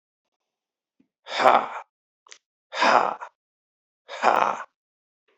exhalation_length: 5.4 s
exhalation_amplitude: 26767
exhalation_signal_mean_std_ratio: 0.32
survey_phase: beta (2021-08-13 to 2022-03-07)
age: 18-44
gender: Male
wearing_mask: 'No'
symptom_cough_any: true
symptom_runny_or_blocked_nose: true
symptom_fatigue: true
symptom_fever_high_temperature: true
symptom_headache: true
symptom_change_to_sense_of_smell_or_taste: true
smoker_status: Never smoked
respiratory_condition_asthma: false
respiratory_condition_other: false
recruitment_source: Test and Trace
submission_delay: 2 days
covid_test_result: Positive
covid_test_method: RT-qPCR
covid_ct_value: 14.5
covid_ct_gene: N gene
covid_ct_mean: 14.7
covid_viral_load: 15000000 copies/ml
covid_viral_load_category: High viral load (>1M copies/ml)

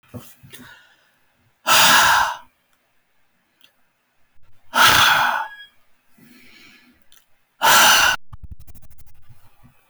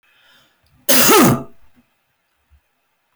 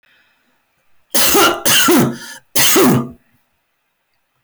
exhalation_length: 9.9 s
exhalation_amplitude: 22999
exhalation_signal_mean_std_ratio: 0.42
cough_length: 3.2 s
cough_amplitude: 24895
cough_signal_mean_std_ratio: 0.38
three_cough_length: 4.4 s
three_cough_amplitude: 24455
three_cough_signal_mean_std_ratio: 0.56
survey_phase: beta (2021-08-13 to 2022-03-07)
age: 45-64
gender: Male
wearing_mask: 'No'
symptom_none: true
smoker_status: Ex-smoker
respiratory_condition_asthma: false
respiratory_condition_other: false
recruitment_source: REACT
submission_delay: 3 days
covid_test_result: Negative
covid_test_method: RT-qPCR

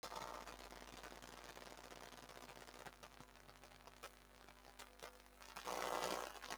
three_cough_length: 6.6 s
three_cough_amplitude: 1440
three_cough_signal_mean_std_ratio: 0.53
survey_phase: beta (2021-08-13 to 2022-03-07)
age: 65+
gender: Female
wearing_mask: 'No'
symptom_runny_or_blocked_nose: true
symptom_sore_throat: true
symptom_headache: true
smoker_status: Never smoked
recruitment_source: Test and Trace
submission_delay: 3 days
covid_test_result: Positive
covid_test_method: RT-qPCR
covid_ct_value: 21.6
covid_ct_gene: ORF1ab gene
covid_ct_mean: 21.9
covid_viral_load: 65000 copies/ml
covid_viral_load_category: Low viral load (10K-1M copies/ml)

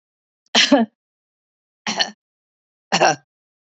three_cough_length: 3.8 s
three_cough_amplitude: 28834
three_cough_signal_mean_std_ratio: 0.32
survey_phase: beta (2021-08-13 to 2022-03-07)
age: 65+
gender: Female
wearing_mask: 'No'
symptom_none: true
smoker_status: Never smoked
respiratory_condition_asthma: false
respiratory_condition_other: false
recruitment_source: REACT
submission_delay: 2 days
covid_test_result: Negative
covid_test_method: RT-qPCR
influenza_a_test_result: Negative
influenza_b_test_result: Negative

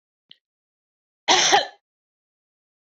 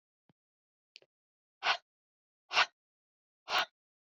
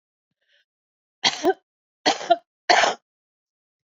cough_length: 2.8 s
cough_amplitude: 27183
cough_signal_mean_std_ratio: 0.28
exhalation_length: 4.1 s
exhalation_amplitude: 5737
exhalation_signal_mean_std_ratio: 0.23
three_cough_length: 3.8 s
three_cough_amplitude: 25796
three_cough_signal_mean_std_ratio: 0.31
survey_phase: beta (2021-08-13 to 2022-03-07)
age: 65+
gender: Female
wearing_mask: 'No'
symptom_cough_any: true
symptom_runny_or_blocked_nose: true
symptom_sore_throat: true
symptom_fever_high_temperature: true
symptom_headache: true
symptom_change_to_sense_of_smell_or_taste: true
symptom_onset: 5 days
smoker_status: Ex-smoker
respiratory_condition_asthma: false
respiratory_condition_other: false
recruitment_source: Test and Trace
submission_delay: 2 days
covid_test_result: Positive
covid_test_method: RT-qPCR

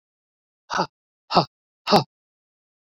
exhalation_length: 3.0 s
exhalation_amplitude: 26683
exhalation_signal_mean_std_ratio: 0.25
survey_phase: beta (2021-08-13 to 2022-03-07)
age: 65+
gender: Male
wearing_mask: 'No'
symptom_none: true
smoker_status: Current smoker (e-cigarettes or vapes only)
respiratory_condition_asthma: false
respiratory_condition_other: false
recruitment_source: REACT
submission_delay: 2 days
covid_test_result: Negative
covid_test_method: RT-qPCR
influenza_a_test_result: Unknown/Void
influenza_b_test_result: Unknown/Void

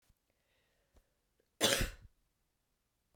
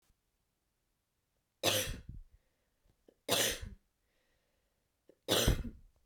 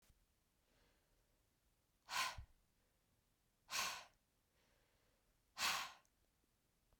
cough_length: 3.2 s
cough_amplitude: 7109
cough_signal_mean_std_ratio: 0.24
three_cough_length: 6.1 s
three_cough_amplitude: 6293
three_cough_signal_mean_std_ratio: 0.33
exhalation_length: 7.0 s
exhalation_amplitude: 1400
exhalation_signal_mean_std_ratio: 0.3
survey_phase: beta (2021-08-13 to 2022-03-07)
age: 45-64
gender: Female
wearing_mask: 'No'
symptom_none: true
smoker_status: Ex-smoker
respiratory_condition_asthma: true
respiratory_condition_other: false
recruitment_source: Test and Trace
submission_delay: 0 days
covid_test_result: Negative
covid_test_method: LFT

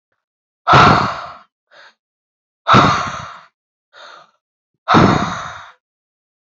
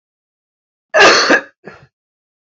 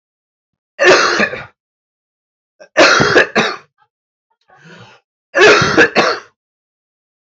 exhalation_length: 6.6 s
exhalation_amplitude: 29633
exhalation_signal_mean_std_ratio: 0.38
cough_length: 2.5 s
cough_amplitude: 30901
cough_signal_mean_std_ratio: 0.37
three_cough_length: 7.3 s
three_cough_amplitude: 32767
three_cough_signal_mean_std_ratio: 0.43
survey_phase: alpha (2021-03-01 to 2021-08-12)
age: 45-64
gender: Male
wearing_mask: 'No'
symptom_cough_any: true
symptom_fatigue: true
symptom_onset: 4 days
smoker_status: Current smoker (1 to 10 cigarettes per day)
respiratory_condition_asthma: false
respiratory_condition_other: false
recruitment_source: Test and Trace
submission_delay: 2 days
covid_test_result: Positive
covid_test_method: RT-qPCR
covid_ct_value: 16.5
covid_ct_gene: ORF1ab gene
covid_ct_mean: 16.7
covid_viral_load: 3200000 copies/ml
covid_viral_load_category: High viral load (>1M copies/ml)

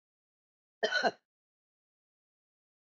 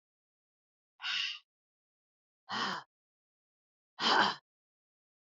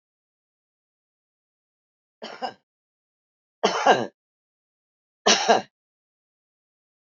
cough_length: 2.8 s
cough_amplitude: 5947
cough_signal_mean_std_ratio: 0.23
exhalation_length: 5.3 s
exhalation_amplitude: 7552
exhalation_signal_mean_std_ratio: 0.31
three_cough_length: 7.1 s
three_cough_amplitude: 25675
three_cough_signal_mean_std_ratio: 0.23
survey_phase: beta (2021-08-13 to 2022-03-07)
age: 65+
gender: Female
wearing_mask: 'No'
symptom_none: true
smoker_status: Current smoker (1 to 10 cigarettes per day)
respiratory_condition_asthma: false
respiratory_condition_other: false
recruitment_source: REACT
submission_delay: -1 day
covid_test_result: Negative
covid_test_method: RT-qPCR
influenza_a_test_result: Negative
influenza_b_test_result: Negative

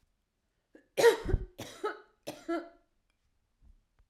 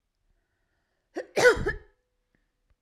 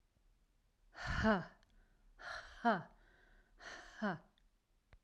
three_cough_length: 4.1 s
three_cough_amplitude: 9149
three_cough_signal_mean_std_ratio: 0.29
cough_length: 2.8 s
cough_amplitude: 16336
cough_signal_mean_std_ratio: 0.26
exhalation_length: 5.0 s
exhalation_amplitude: 2780
exhalation_signal_mean_std_ratio: 0.36
survey_phase: beta (2021-08-13 to 2022-03-07)
age: 45-64
gender: Female
wearing_mask: 'No'
symptom_headache: true
smoker_status: Ex-smoker
respiratory_condition_asthma: true
respiratory_condition_other: false
recruitment_source: REACT
submission_delay: 2 days
covid_test_result: Negative
covid_test_method: RT-qPCR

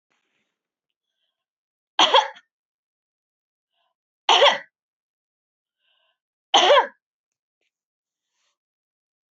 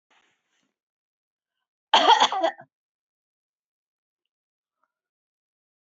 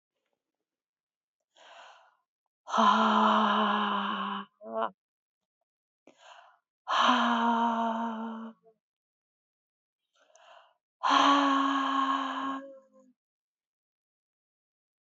three_cough_length: 9.3 s
three_cough_amplitude: 23850
three_cough_signal_mean_std_ratio: 0.23
cough_length: 5.8 s
cough_amplitude: 22071
cough_signal_mean_std_ratio: 0.22
exhalation_length: 15.0 s
exhalation_amplitude: 9237
exhalation_signal_mean_std_ratio: 0.47
survey_phase: beta (2021-08-13 to 2022-03-07)
age: 45-64
gender: Female
wearing_mask: 'No'
symptom_none: true
smoker_status: Never smoked
respiratory_condition_asthma: false
respiratory_condition_other: false
recruitment_source: REACT
submission_delay: 2 days
covid_test_result: Negative
covid_test_method: RT-qPCR
influenza_a_test_result: Negative
influenza_b_test_result: Negative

